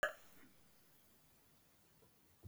{
  "cough_length": "2.5 s",
  "cough_amplitude": 2016,
  "cough_signal_mean_std_ratio": 0.28,
  "survey_phase": "beta (2021-08-13 to 2022-03-07)",
  "age": "65+",
  "gender": "Female",
  "wearing_mask": "No",
  "symptom_none": true,
  "smoker_status": "Never smoked",
  "respiratory_condition_asthma": false,
  "respiratory_condition_other": false,
  "recruitment_source": "REACT",
  "submission_delay": "8 days",
  "covid_test_result": "Negative",
  "covid_test_method": "RT-qPCR",
  "influenza_a_test_result": "Negative",
  "influenza_b_test_result": "Negative"
}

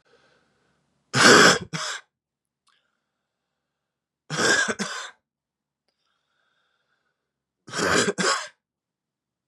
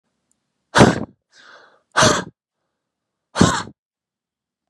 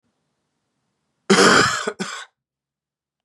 {
  "three_cough_length": "9.5 s",
  "three_cough_amplitude": 28734,
  "three_cough_signal_mean_std_ratio": 0.31,
  "exhalation_length": "4.7 s",
  "exhalation_amplitude": 32768,
  "exhalation_signal_mean_std_ratio": 0.29,
  "cough_length": "3.2 s",
  "cough_amplitude": 30923,
  "cough_signal_mean_std_ratio": 0.34,
  "survey_phase": "beta (2021-08-13 to 2022-03-07)",
  "age": "18-44",
  "gender": "Male",
  "wearing_mask": "No",
  "symptom_runny_or_blocked_nose": true,
  "symptom_sore_throat": true,
  "symptom_fatigue": true,
  "symptom_headache": true,
  "smoker_status": "Never smoked",
  "respiratory_condition_asthma": false,
  "respiratory_condition_other": false,
  "recruitment_source": "Test and Trace",
  "submission_delay": "1 day",
  "covid_test_result": "Positive",
  "covid_test_method": "RT-qPCR",
  "covid_ct_value": 32.6,
  "covid_ct_gene": "ORF1ab gene",
  "covid_ct_mean": 33.2,
  "covid_viral_load": "13 copies/ml",
  "covid_viral_load_category": "Minimal viral load (< 10K copies/ml)"
}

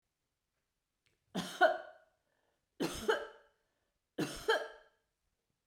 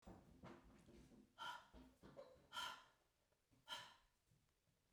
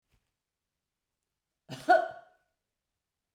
{
  "three_cough_length": "5.7 s",
  "three_cough_amplitude": 6121,
  "three_cough_signal_mean_std_ratio": 0.31,
  "exhalation_length": "4.9 s",
  "exhalation_amplitude": 407,
  "exhalation_signal_mean_std_ratio": 0.51,
  "cough_length": "3.3 s",
  "cough_amplitude": 9329,
  "cough_signal_mean_std_ratio": 0.19,
  "survey_phase": "beta (2021-08-13 to 2022-03-07)",
  "age": "65+",
  "gender": "Female",
  "wearing_mask": "No",
  "symptom_none": true,
  "smoker_status": "Never smoked",
  "respiratory_condition_asthma": false,
  "respiratory_condition_other": false,
  "recruitment_source": "REACT",
  "submission_delay": "2 days",
  "covid_test_result": "Negative",
  "covid_test_method": "RT-qPCR"
}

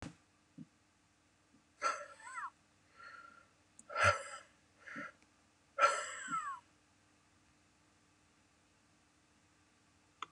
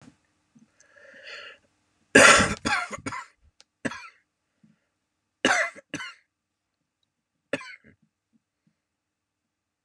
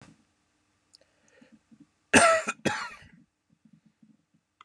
{
  "exhalation_length": "10.3 s",
  "exhalation_amplitude": 5225,
  "exhalation_signal_mean_std_ratio": 0.3,
  "three_cough_length": "9.8 s",
  "three_cough_amplitude": 28750,
  "three_cough_signal_mean_std_ratio": 0.24,
  "cough_length": "4.6 s",
  "cough_amplitude": 21317,
  "cough_signal_mean_std_ratio": 0.25,
  "survey_phase": "beta (2021-08-13 to 2022-03-07)",
  "age": "18-44",
  "gender": "Male",
  "wearing_mask": "No",
  "symptom_cough_any": true,
  "smoker_status": "Never smoked",
  "respiratory_condition_asthma": false,
  "respiratory_condition_other": false,
  "recruitment_source": "REACT",
  "submission_delay": "2 days",
  "covid_test_result": "Negative",
  "covid_test_method": "RT-qPCR",
  "influenza_a_test_result": "Negative",
  "influenza_b_test_result": "Negative"
}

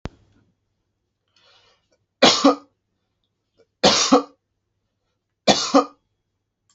{
  "three_cough_length": "6.7 s",
  "three_cough_amplitude": 32768,
  "three_cough_signal_mean_std_ratio": 0.28,
  "survey_phase": "alpha (2021-03-01 to 2021-08-12)",
  "age": "45-64",
  "gender": "Male",
  "wearing_mask": "No",
  "symptom_none": true,
  "smoker_status": "Never smoked",
  "respiratory_condition_asthma": false,
  "respiratory_condition_other": false,
  "recruitment_source": "REACT",
  "submission_delay": "1 day",
  "covid_test_result": "Negative",
  "covid_test_method": "RT-qPCR"
}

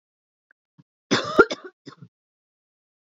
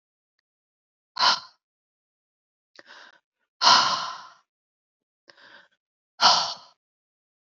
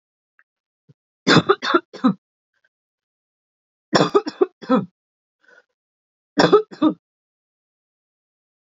{
  "cough_length": "3.1 s",
  "cough_amplitude": 29072,
  "cough_signal_mean_std_ratio": 0.21,
  "exhalation_length": "7.6 s",
  "exhalation_amplitude": 24255,
  "exhalation_signal_mean_std_ratio": 0.27,
  "three_cough_length": "8.6 s",
  "three_cough_amplitude": 31647,
  "three_cough_signal_mean_std_ratio": 0.29,
  "survey_phase": "beta (2021-08-13 to 2022-03-07)",
  "age": "45-64",
  "gender": "Female",
  "wearing_mask": "No",
  "symptom_none": true,
  "smoker_status": "Current smoker (e-cigarettes or vapes only)",
  "respiratory_condition_asthma": false,
  "respiratory_condition_other": false,
  "recruitment_source": "REACT",
  "submission_delay": "2 days",
  "covid_test_result": "Negative",
  "covid_test_method": "RT-qPCR",
  "influenza_a_test_result": "Negative",
  "influenza_b_test_result": "Negative"
}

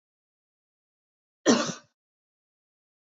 {
  "cough_length": "3.1 s",
  "cough_amplitude": 13180,
  "cough_signal_mean_std_ratio": 0.21,
  "survey_phase": "beta (2021-08-13 to 2022-03-07)",
  "age": "18-44",
  "gender": "Female",
  "wearing_mask": "No",
  "symptom_fatigue": true,
  "symptom_headache": true,
  "smoker_status": "Never smoked",
  "respiratory_condition_asthma": false,
  "respiratory_condition_other": false,
  "recruitment_source": "REACT",
  "submission_delay": "2 days",
  "covid_test_result": "Negative",
  "covid_test_method": "RT-qPCR",
  "influenza_a_test_result": "Negative",
  "influenza_b_test_result": "Negative"
}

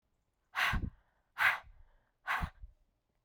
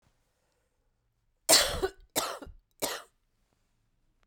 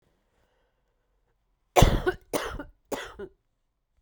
{
  "exhalation_length": "3.2 s",
  "exhalation_amplitude": 4498,
  "exhalation_signal_mean_std_ratio": 0.39,
  "three_cough_length": "4.3 s",
  "three_cough_amplitude": 18388,
  "three_cough_signal_mean_std_ratio": 0.28,
  "cough_length": "4.0 s",
  "cough_amplitude": 23624,
  "cough_signal_mean_std_ratio": 0.27,
  "survey_phase": "beta (2021-08-13 to 2022-03-07)",
  "age": "45-64",
  "gender": "Female",
  "wearing_mask": "No",
  "symptom_cough_any": true,
  "symptom_sore_throat": true,
  "symptom_fatigue": true,
  "symptom_headache": true,
  "symptom_change_to_sense_of_smell_or_taste": true,
  "symptom_loss_of_taste": true,
  "symptom_onset": "6 days",
  "smoker_status": "Current smoker (1 to 10 cigarettes per day)",
  "respiratory_condition_asthma": false,
  "respiratory_condition_other": false,
  "recruitment_source": "Test and Trace",
  "submission_delay": "2 days",
  "covid_test_result": "Positive",
  "covid_test_method": "RT-qPCR"
}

